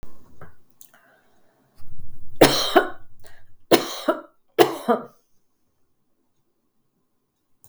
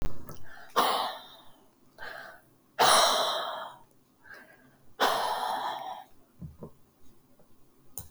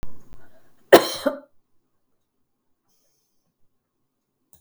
{
  "three_cough_length": "7.7 s",
  "three_cough_amplitude": 32768,
  "three_cough_signal_mean_std_ratio": 0.4,
  "exhalation_length": "8.1 s",
  "exhalation_amplitude": 11922,
  "exhalation_signal_mean_std_ratio": 0.5,
  "cough_length": "4.6 s",
  "cough_amplitude": 32768,
  "cough_signal_mean_std_ratio": 0.21,
  "survey_phase": "beta (2021-08-13 to 2022-03-07)",
  "age": "65+",
  "gender": "Female",
  "wearing_mask": "No",
  "symptom_cough_any": true,
  "smoker_status": "Never smoked",
  "respiratory_condition_asthma": true,
  "respiratory_condition_other": true,
  "recruitment_source": "REACT",
  "submission_delay": "2 days",
  "covid_test_result": "Negative",
  "covid_test_method": "RT-qPCR",
  "influenza_a_test_result": "Negative",
  "influenza_b_test_result": "Negative"
}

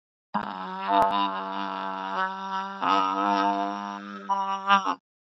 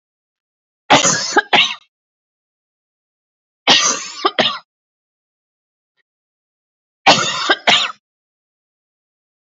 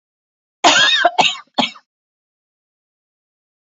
{
  "exhalation_length": "5.3 s",
  "exhalation_amplitude": 19265,
  "exhalation_signal_mean_std_ratio": 0.7,
  "three_cough_length": "9.5 s",
  "three_cough_amplitude": 32457,
  "three_cough_signal_mean_std_ratio": 0.34,
  "cough_length": "3.7 s",
  "cough_amplitude": 32767,
  "cough_signal_mean_std_ratio": 0.36,
  "survey_phase": "beta (2021-08-13 to 2022-03-07)",
  "age": "18-44",
  "gender": "Female",
  "wearing_mask": "No",
  "symptom_cough_any": true,
  "symptom_runny_or_blocked_nose": true,
  "symptom_headache": true,
  "smoker_status": "Never smoked",
  "respiratory_condition_asthma": false,
  "respiratory_condition_other": false,
  "recruitment_source": "Test and Trace",
  "submission_delay": "2 days",
  "covid_test_result": "Positive",
  "covid_test_method": "LFT"
}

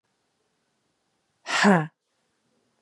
{
  "exhalation_length": "2.8 s",
  "exhalation_amplitude": 18845,
  "exhalation_signal_mean_std_ratio": 0.27,
  "survey_phase": "beta (2021-08-13 to 2022-03-07)",
  "age": "18-44",
  "gender": "Female",
  "wearing_mask": "No",
  "symptom_runny_or_blocked_nose": true,
  "symptom_fatigue": true,
  "symptom_headache": true,
  "symptom_onset": "12 days",
  "smoker_status": "Ex-smoker",
  "respiratory_condition_asthma": false,
  "respiratory_condition_other": false,
  "recruitment_source": "REACT",
  "submission_delay": "1 day",
  "covid_test_result": "Negative",
  "covid_test_method": "RT-qPCR",
  "influenza_a_test_result": "Negative",
  "influenza_b_test_result": "Negative"
}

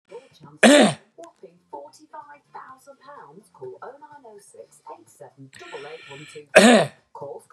{
  "cough_length": "7.5 s",
  "cough_amplitude": 32768,
  "cough_signal_mean_std_ratio": 0.28,
  "survey_phase": "beta (2021-08-13 to 2022-03-07)",
  "age": "65+",
  "gender": "Male",
  "wearing_mask": "No",
  "symptom_none": true,
  "smoker_status": "Ex-smoker",
  "respiratory_condition_asthma": false,
  "respiratory_condition_other": false,
  "recruitment_source": "REACT",
  "submission_delay": "-1 day",
  "covid_test_result": "Negative",
  "covid_test_method": "RT-qPCR",
  "influenza_a_test_result": "Negative",
  "influenza_b_test_result": "Negative"
}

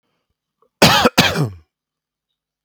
{
  "cough_length": "2.6 s",
  "cough_amplitude": 32768,
  "cough_signal_mean_std_ratio": 0.36,
  "survey_phase": "beta (2021-08-13 to 2022-03-07)",
  "age": "45-64",
  "gender": "Male",
  "wearing_mask": "No",
  "symptom_none": true,
  "symptom_onset": "5 days",
  "smoker_status": "Ex-smoker",
  "respiratory_condition_asthma": true,
  "respiratory_condition_other": false,
  "recruitment_source": "REACT",
  "submission_delay": "2 days",
  "covid_test_result": "Positive",
  "covid_test_method": "RT-qPCR",
  "covid_ct_value": 20.7,
  "covid_ct_gene": "E gene",
  "influenza_a_test_result": "Negative",
  "influenza_b_test_result": "Negative"
}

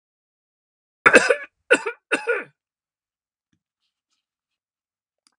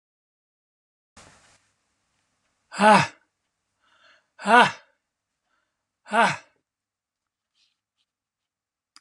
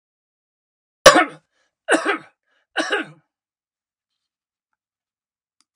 {
  "cough_length": "5.4 s",
  "cough_amplitude": 32767,
  "cough_signal_mean_std_ratio": 0.23,
  "exhalation_length": "9.0 s",
  "exhalation_amplitude": 30506,
  "exhalation_signal_mean_std_ratio": 0.21,
  "three_cough_length": "5.8 s",
  "three_cough_amplitude": 32768,
  "three_cough_signal_mean_std_ratio": 0.22,
  "survey_phase": "alpha (2021-03-01 to 2021-08-12)",
  "age": "65+",
  "gender": "Male",
  "wearing_mask": "No",
  "symptom_cough_any": true,
  "symptom_onset": "12 days",
  "smoker_status": "Never smoked",
  "respiratory_condition_asthma": false,
  "respiratory_condition_other": false,
  "recruitment_source": "REACT",
  "submission_delay": "1 day",
  "covid_test_result": "Negative",
  "covid_test_method": "RT-qPCR"
}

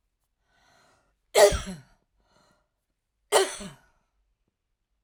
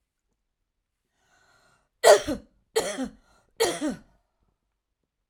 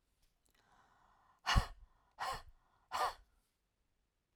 {
  "cough_length": "5.0 s",
  "cough_amplitude": 19624,
  "cough_signal_mean_std_ratio": 0.23,
  "three_cough_length": "5.3 s",
  "three_cough_amplitude": 22893,
  "three_cough_signal_mean_std_ratio": 0.26,
  "exhalation_length": "4.4 s",
  "exhalation_amplitude": 4402,
  "exhalation_signal_mean_std_ratio": 0.28,
  "survey_phase": "alpha (2021-03-01 to 2021-08-12)",
  "age": "45-64",
  "gender": "Female",
  "wearing_mask": "No",
  "symptom_none": true,
  "smoker_status": "Ex-smoker",
  "respiratory_condition_asthma": false,
  "respiratory_condition_other": false,
  "recruitment_source": "REACT",
  "submission_delay": "1 day",
  "covid_test_result": "Negative",
  "covid_test_method": "RT-qPCR"
}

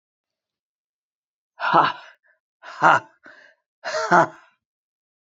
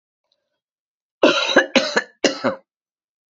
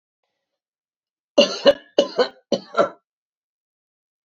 {
  "exhalation_length": "5.3 s",
  "exhalation_amplitude": 27878,
  "exhalation_signal_mean_std_ratio": 0.29,
  "cough_length": "3.3 s",
  "cough_amplitude": 30591,
  "cough_signal_mean_std_ratio": 0.37,
  "three_cough_length": "4.3 s",
  "three_cough_amplitude": 31182,
  "three_cough_signal_mean_std_ratio": 0.28,
  "survey_phase": "beta (2021-08-13 to 2022-03-07)",
  "age": "65+",
  "gender": "Female",
  "wearing_mask": "No",
  "symptom_cough_any": true,
  "symptom_new_continuous_cough": true,
  "symptom_fatigue": true,
  "symptom_fever_high_temperature": true,
  "symptom_onset": "4 days",
  "smoker_status": "Never smoked",
  "respiratory_condition_asthma": false,
  "respiratory_condition_other": false,
  "recruitment_source": "Test and Trace",
  "submission_delay": "1 day",
  "covid_test_result": "Positive",
  "covid_test_method": "ePCR"
}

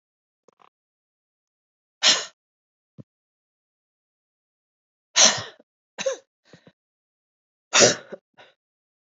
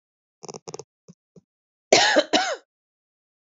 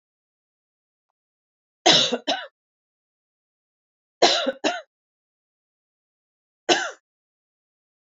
{
  "exhalation_length": "9.1 s",
  "exhalation_amplitude": 32375,
  "exhalation_signal_mean_std_ratio": 0.21,
  "cough_length": "3.5 s",
  "cough_amplitude": 27315,
  "cough_signal_mean_std_ratio": 0.3,
  "three_cough_length": "8.1 s",
  "three_cough_amplitude": 27441,
  "three_cough_signal_mean_std_ratio": 0.26,
  "survey_phase": "beta (2021-08-13 to 2022-03-07)",
  "age": "45-64",
  "gender": "Female",
  "wearing_mask": "No",
  "symptom_cough_any": true,
  "symptom_runny_or_blocked_nose": true,
  "symptom_shortness_of_breath": true,
  "symptom_sore_throat": true,
  "symptom_fatigue": true,
  "symptom_headache": true,
  "symptom_change_to_sense_of_smell_or_taste": true,
  "symptom_loss_of_taste": true,
  "symptom_onset": "4 days",
  "smoker_status": "Never smoked",
  "respiratory_condition_asthma": false,
  "respiratory_condition_other": false,
  "recruitment_source": "Test and Trace",
  "submission_delay": "2 days",
  "covid_test_result": "Positive",
  "covid_test_method": "ePCR"
}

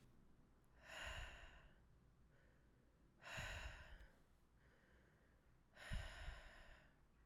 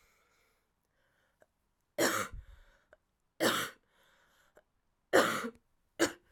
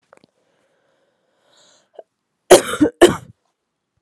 {
  "exhalation_length": "7.3 s",
  "exhalation_amplitude": 560,
  "exhalation_signal_mean_std_ratio": 0.58,
  "three_cough_length": "6.3 s",
  "three_cough_amplitude": 9757,
  "three_cough_signal_mean_std_ratio": 0.31,
  "cough_length": "4.0 s",
  "cough_amplitude": 32768,
  "cough_signal_mean_std_ratio": 0.22,
  "survey_phase": "alpha (2021-03-01 to 2021-08-12)",
  "age": "18-44",
  "gender": "Female",
  "wearing_mask": "No",
  "symptom_cough_any": true,
  "symptom_abdominal_pain": true,
  "symptom_fatigue": true,
  "smoker_status": "Prefer not to say",
  "respiratory_condition_asthma": false,
  "respiratory_condition_other": false,
  "recruitment_source": "Test and Trace",
  "submission_delay": "1 day",
  "covid_test_result": "Positive",
  "covid_test_method": "RT-qPCR"
}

